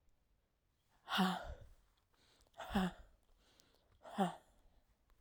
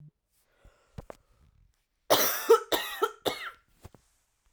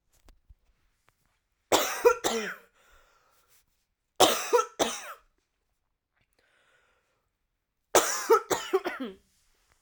{"exhalation_length": "5.2 s", "exhalation_amplitude": 2422, "exhalation_signal_mean_std_ratio": 0.34, "cough_length": "4.5 s", "cough_amplitude": 16485, "cough_signal_mean_std_ratio": 0.31, "three_cough_length": "9.8 s", "three_cough_amplitude": 19920, "three_cough_signal_mean_std_ratio": 0.32, "survey_phase": "alpha (2021-03-01 to 2021-08-12)", "age": "18-44", "gender": "Female", "wearing_mask": "No", "symptom_cough_any": true, "symptom_new_continuous_cough": true, "symptom_shortness_of_breath": true, "symptom_abdominal_pain": true, "symptom_diarrhoea": true, "symptom_fatigue": true, "symptom_fever_high_temperature": true, "symptom_headache": true, "symptom_change_to_sense_of_smell_or_taste": true, "symptom_onset": "7 days", "smoker_status": "Ex-smoker", "respiratory_condition_asthma": false, "respiratory_condition_other": false, "recruitment_source": "Test and Trace", "submission_delay": "2 days", "covid_test_result": "Positive", "covid_test_method": "RT-qPCR"}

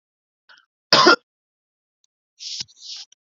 {"cough_length": "3.2 s", "cough_amplitude": 32768, "cough_signal_mean_std_ratio": 0.25, "survey_phase": "beta (2021-08-13 to 2022-03-07)", "age": "18-44", "gender": "Male", "wearing_mask": "No", "symptom_none": true, "smoker_status": "Never smoked", "respiratory_condition_asthma": true, "respiratory_condition_other": false, "recruitment_source": "REACT", "submission_delay": "1 day", "covid_test_result": "Negative", "covid_test_method": "RT-qPCR", "influenza_a_test_result": "Negative", "influenza_b_test_result": "Negative"}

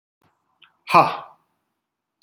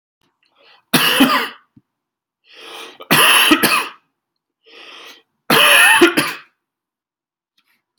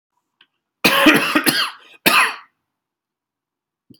{"exhalation_length": "2.2 s", "exhalation_amplitude": 28064, "exhalation_signal_mean_std_ratio": 0.23, "three_cough_length": "8.0 s", "three_cough_amplitude": 32768, "three_cough_signal_mean_std_ratio": 0.43, "cough_length": "4.0 s", "cough_amplitude": 32725, "cough_signal_mean_std_ratio": 0.41, "survey_phase": "alpha (2021-03-01 to 2021-08-12)", "age": "45-64", "gender": "Male", "wearing_mask": "No", "symptom_none": true, "smoker_status": "Never smoked", "respiratory_condition_asthma": false, "respiratory_condition_other": false, "recruitment_source": "REACT", "submission_delay": "2 days", "covid_test_result": "Negative", "covid_test_method": "RT-qPCR"}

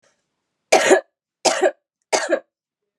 {"three_cough_length": "3.0 s", "three_cough_amplitude": 32766, "three_cough_signal_mean_std_ratio": 0.38, "survey_phase": "beta (2021-08-13 to 2022-03-07)", "age": "18-44", "gender": "Female", "wearing_mask": "No", "symptom_cough_any": true, "symptom_runny_or_blocked_nose": true, "symptom_abdominal_pain": true, "symptom_fatigue": true, "symptom_change_to_sense_of_smell_or_taste": true, "symptom_loss_of_taste": true, "symptom_onset": "3 days", "smoker_status": "Never smoked", "respiratory_condition_asthma": false, "respiratory_condition_other": false, "recruitment_source": "Test and Trace", "submission_delay": "1 day", "covid_test_result": "Positive", "covid_test_method": "RT-qPCR"}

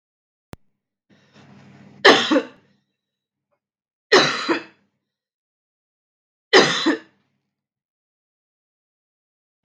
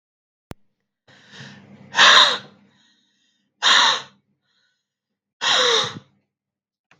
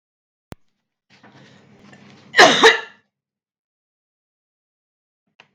{"three_cough_length": "9.6 s", "three_cough_amplitude": 32768, "three_cough_signal_mean_std_ratio": 0.25, "exhalation_length": "7.0 s", "exhalation_amplitude": 32768, "exhalation_signal_mean_std_ratio": 0.34, "cough_length": "5.5 s", "cough_amplitude": 32768, "cough_signal_mean_std_ratio": 0.22, "survey_phase": "beta (2021-08-13 to 2022-03-07)", "age": "18-44", "gender": "Female", "wearing_mask": "No", "symptom_cough_any": true, "symptom_runny_or_blocked_nose": true, "symptom_fatigue": true, "symptom_headache": true, "symptom_change_to_sense_of_smell_or_taste": true, "symptom_loss_of_taste": true, "symptom_other": true, "symptom_onset": "4 days", "smoker_status": "Never smoked", "respiratory_condition_asthma": false, "respiratory_condition_other": false, "recruitment_source": "Test and Trace", "submission_delay": "2 days", "covid_test_result": "Positive", "covid_test_method": "RT-qPCR", "covid_ct_value": 26.0, "covid_ct_gene": "ORF1ab gene", "covid_ct_mean": 26.5, "covid_viral_load": "2000 copies/ml", "covid_viral_load_category": "Minimal viral load (< 10K copies/ml)"}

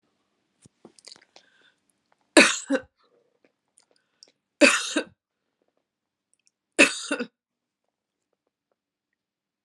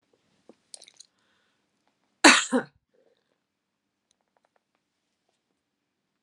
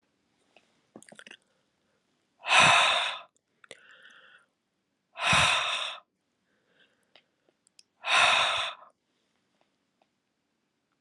{"three_cough_length": "9.6 s", "three_cough_amplitude": 32675, "three_cough_signal_mean_std_ratio": 0.21, "cough_length": "6.2 s", "cough_amplitude": 32640, "cough_signal_mean_std_ratio": 0.15, "exhalation_length": "11.0 s", "exhalation_amplitude": 15235, "exhalation_signal_mean_std_ratio": 0.34, "survey_phase": "alpha (2021-03-01 to 2021-08-12)", "age": "65+", "gender": "Female", "wearing_mask": "No", "symptom_none": true, "smoker_status": "Never smoked", "respiratory_condition_asthma": false, "respiratory_condition_other": false, "recruitment_source": "REACT", "submission_delay": "1 day", "covid_test_result": "Negative", "covid_test_method": "RT-qPCR"}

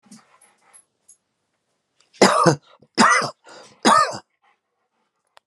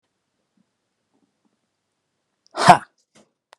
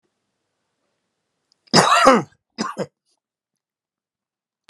{"three_cough_length": "5.5 s", "three_cough_amplitude": 32637, "three_cough_signal_mean_std_ratio": 0.33, "exhalation_length": "3.6 s", "exhalation_amplitude": 32768, "exhalation_signal_mean_std_ratio": 0.15, "cough_length": "4.7 s", "cough_amplitude": 32767, "cough_signal_mean_std_ratio": 0.27, "survey_phase": "beta (2021-08-13 to 2022-03-07)", "age": "65+", "gender": "Male", "wearing_mask": "No", "symptom_none": true, "smoker_status": "Ex-smoker", "respiratory_condition_asthma": false, "respiratory_condition_other": false, "recruitment_source": "REACT", "submission_delay": "1 day", "covid_test_result": "Negative", "covid_test_method": "RT-qPCR"}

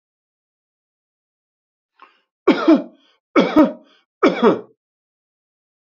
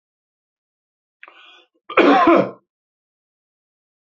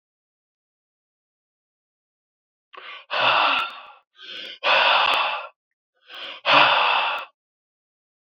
{"three_cough_length": "5.9 s", "three_cough_amplitude": 27657, "three_cough_signal_mean_std_ratio": 0.3, "cough_length": "4.2 s", "cough_amplitude": 28763, "cough_signal_mean_std_ratio": 0.29, "exhalation_length": "8.3 s", "exhalation_amplitude": 25104, "exhalation_signal_mean_std_ratio": 0.44, "survey_phase": "beta (2021-08-13 to 2022-03-07)", "age": "45-64", "gender": "Male", "wearing_mask": "No", "symptom_none": true, "symptom_onset": "12 days", "smoker_status": "Ex-smoker", "respiratory_condition_asthma": false, "respiratory_condition_other": false, "recruitment_source": "REACT", "submission_delay": "2 days", "covid_test_result": "Positive", "covid_test_method": "RT-qPCR", "covid_ct_value": 36.0, "covid_ct_gene": "N gene", "influenza_a_test_result": "Negative", "influenza_b_test_result": "Negative"}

